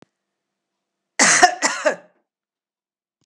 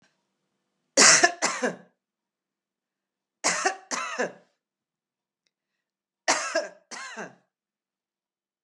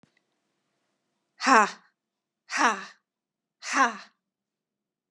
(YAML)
cough_length: 3.3 s
cough_amplitude: 32767
cough_signal_mean_std_ratio: 0.31
three_cough_length: 8.6 s
three_cough_amplitude: 25401
three_cough_signal_mean_std_ratio: 0.29
exhalation_length: 5.1 s
exhalation_amplitude: 20658
exhalation_signal_mean_std_ratio: 0.27
survey_phase: beta (2021-08-13 to 2022-03-07)
age: 65+
gender: Female
wearing_mask: 'No'
symptom_none: true
smoker_status: Never smoked
respiratory_condition_asthma: false
respiratory_condition_other: false
recruitment_source: REACT
submission_delay: 2 days
covid_test_result: Negative
covid_test_method: RT-qPCR
influenza_a_test_result: Negative
influenza_b_test_result: Negative